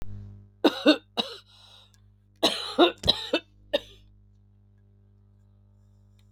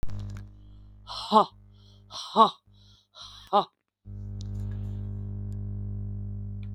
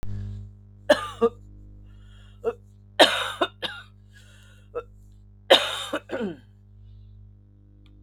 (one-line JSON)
{"cough_length": "6.3 s", "cough_amplitude": 17908, "cough_signal_mean_std_ratio": 0.32, "exhalation_length": "6.7 s", "exhalation_amplitude": 20860, "exhalation_signal_mean_std_ratio": 0.49, "three_cough_length": "8.0 s", "three_cough_amplitude": 32159, "three_cough_signal_mean_std_ratio": 0.35, "survey_phase": "beta (2021-08-13 to 2022-03-07)", "age": "45-64", "gender": "Female", "wearing_mask": "No", "symptom_cough_any": true, "symptom_shortness_of_breath": true, "symptom_sore_throat": true, "symptom_fatigue": true, "symptom_fever_high_temperature": true, "symptom_headache": true, "symptom_onset": "3 days", "smoker_status": "Ex-smoker", "respiratory_condition_asthma": true, "respiratory_condition_other": false, "recruitment_source": "Test and Trace", "submission_delay": "2 days", "covid_test_result": "Negative", "covid_test_method": "RT-qPCR"}